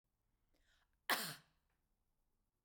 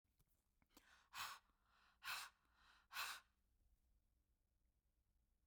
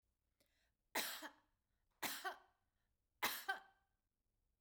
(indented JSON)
{
  "cough_length": "2.6 s",
  "cough_amplitude": 2964,
  "cough_signal_mean_std_ratio": 0.22,
  "exhalation_length": "5.5 s",
  "exhalation_amplitude": 541,
  "exhalation_signal_mean_std_ratio": 0.35,
  "three_cough_length": "4.6 s",
  "three_cough_amplitude": 1812,
  "three_cough_signal_mean_std_ratio": 0.34,
  "survey_phase": "beta (2021-08-13 to 2022-03-07)",
  "age": "45-64",
  "gender": "Female",
  "wearing_mask": "No",
  "symptom_none": true,
  "smoker_status": "Never smoked",
  "respiratory_condition_asthma": false,
  "respiratory_condition_other": false,
  "recruitment_source": "REACT",
  "submission_delay": "1 day",
  "covid_test_result": "Negative",
  "covid_test_method": "RT-qPCR"
}